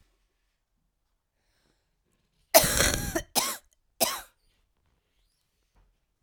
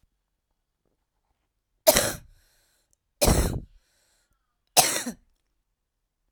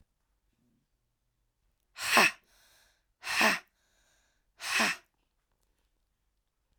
{"cough_length": "6.2 s", "cough_amplitude": 27203, "cough_signal_mean_std_ratio": 0.26, "three_cough_length": "6.3 s", "three_cough_amplitude": 32767, "three_cough_signal_mean_std_ratio": 0.27, "exhalation_length": "6.8 s", "exhalation_amplitude": 16300, "exhalation_signal_mean_std_ratio": 0.27, "survey_phase": "beta (2021-08-13 to 2022-03-07)", "age": "45-64", "gender": "Female", "wearing_mask": "No", "symptom_cough_any": true, "symptom_runny_or_blocked_nose": true, "symptom_sore_throat": true, "symptom_fatigue": true, "symptom_headache": true, "symptom_onset": "3 days", "smoker_status": "Never smoked", "respiratory_condition_asthma": true, "respiratory_condition_other": false, "recruitment_source": "Test and Trace", "submission_delay": "2 days", "covid_test_result": "Negative", "covid_test_method": "RT-qPCR"}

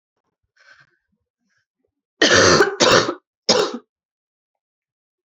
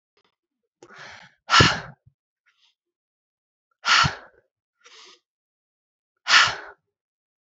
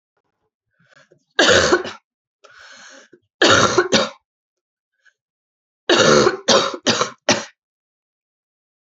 {"cough_length": "5.3 s", "cough_amplitude": 32767, "cough_signal_mean_std_ratio": 0.35, "exhalation_length": "7.6 s", "exhalation_amplitude": 27443, "exhalation_signal_mean_std_ratio": 0.26, "three_cough_length": "8.9 s", "three_cough_amplitude": 32767, "three_cough_signal_mean_std_ratio": 0.39, "survey_phase": "alpha (2021-03-01 to 2021-08-12)", "age": "18-44", "gender": "Female", "wearing_mask": "No", "symptom_cough_any": true, "symptom_fatigue": true, "symptom_fever_high_temperature": true, "symptom_headache": true, "symptom_onset": "5 days", "smoker_status": "Ex-smoker", "respiratory_condition_asthma": false, "respiratory_condition_other": false, "recruitment_source": "Test and Trace", "submission_delay": "1 day", "covid_test_result": "Positive", "covid_test_method": "RT-qPCR", "covid_ct_value": 17.9, "covid_ct_gene": "ORF1ab gene", "covid_ct_mean": 18.9, "covid_viral_load": "630000 copies/ml", "covid_viral_load_category": "Low viral load (10K-1M copies/ml)"}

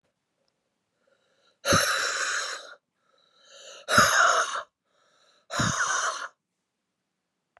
{"exhalation_length": "7.6 s", "exhalation_amplitude": 22244, "exhalation_signal_mean_std_ratio": 0.43, "survey_phase": "beta (2021-08-13 to 2022-03-07)", "age": "45-64", "gender": "Female", "wearing_mask": "No", "symptom_cough_any": true, "symptom_new_continuous_cough": true, "symptom_runny_or_blocked_nose": true, "symptom_fatigue": true, "symptom_fever_high_temperature": true, "symptom_headache": true, "symptom_change_to_sense_of_smell_or_taste": true, "symptom_loss_of_taste": true, "symptom_onset": "5 days", "smoker_status": "Never smoked", "respiratory_condition_asthma": false, "respiratory_condition_other": false, "recruitment_source": "Test and Trace", "submission_delay": "2 days", "covid_test_result": "Positive", "covid_test_method": "RT-qPCR", "covid_ct_value": 17.1, "covid_ct_gene": "ORF1ab gene", "covid_ct_mean": 17.6, "covid_viral_load": "1700000 copies/ml", "covid_viral_load_category": "High viral load (>1M copies/ml)"}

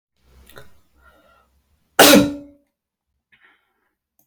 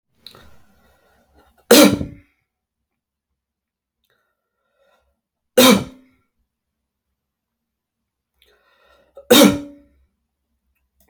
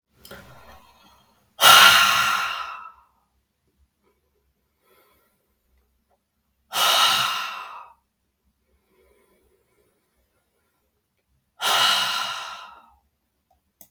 {"cough_length": "4.3 s", "cough_amplitude": 32768, "cough_signal_mean_std_ratio": 0.23, "three_cough_length": "11.1 s", "three_cough_amplitude": 32768, "three_cough_signal_mean_std_ratio": 0.22, "exhalation_length": "13.9 s", "exhalation_amplitude": 32768, "exhalation_signal_mean_std_ratio": 0.32, "survey_phase": "beta (2021-08-13 to 2022-03-07)", "age": "45-64", "gender": "Male", "wearing_mask": "No", "symptom_none": true, "smoker_status": "Prefer not to say", "respiratory_condition_asthma": false, "respiratory_condition_other": false, "recruitment_source": "REACT", "submission_delay": "1 day", "covid_test_result": "Negative", "covid_test_method": "RT-qPCR"}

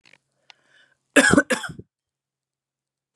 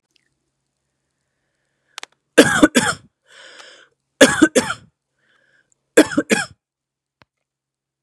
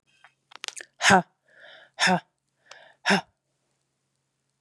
{"cough_length": "3.2 s", "cough_amplitude": 30228, "cough_signal_mean_std_ratio": 0.25, "three_cough_length": "8.0 s", "three_cough_amplitude": 32768, "three_cough_signal_mean_std_ratio": 0.26, "exhalation_length": "4.6 s", "exhalation_amplitude": 24478, "exhalation_signal_mean_std_ratio": 0.27, "survey_phase": "beta (2021-08-13 to 2022-03-07)", "age": "18-44", "gender": "Female", "wearing_mask": "No", "symptom_cough_any": true, "symptom_runny_or_blocked_nose": true, "symptom_sore_throat": true, "symptom_fatigue": true, "symptom_other": true, "symptom_onset": "3 days", "smoker_status": "Ex-smoker", "respiratory_condition_asthma": false, "respiratory_condition_other": false, "recruitment_source": "Test and Trace", "submission_delay": "2 days", "covid_test_result": "Positive", "covid_test_method": "ePCR"}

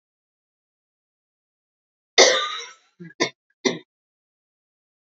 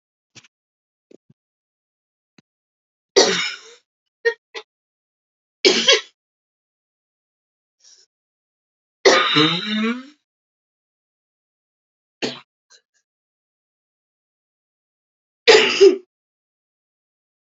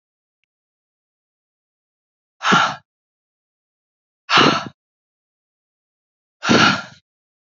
{"cough_length": "5.1 s", "cough_amplitude": 32767, "cough_signal_mean_std_ratio": 0.23, "three_cough_length": "17.6 s", "three_cough_amplitude": 32477, "three_cough_signal_mean_std_ratio": 0.25, "exhalation_length": "7.6 s", "exhalation_amplitude": 32768, "exhalation_signal_mean_std_ratio": 0.28, "survey_phase": "alpha (2021-03-01 to 2021-08-12)", "age": "18-44", "gender": "Female", "wearing_mask": "No", "symptom_cough_any": true, "symptom_fatigue": true, "symptom_headache": true, "symptom_change_to_sense_of_smell_or_taste": true, "symptom_loss_of_taste": true, "symptom_onset": "2 days", "smoker_status": "Never smoked", "respiratory_condition_asthma": false, "respiratory_condition_other": false, "recruitment_source": "Test and Trace", "submission_delay": "2 days", "covid_test_result": "Positive", "covid_test_method": "RT-qPCR", "covid_ct_value": 21.2, "covid_ct_gene": "ORF1ab gene", "covid_ct_mean": 21.9, "covid_viral_load": "65000 copies/ml", "covid_viral_load_category": "Low viral load (10K-1M copies/ml)"}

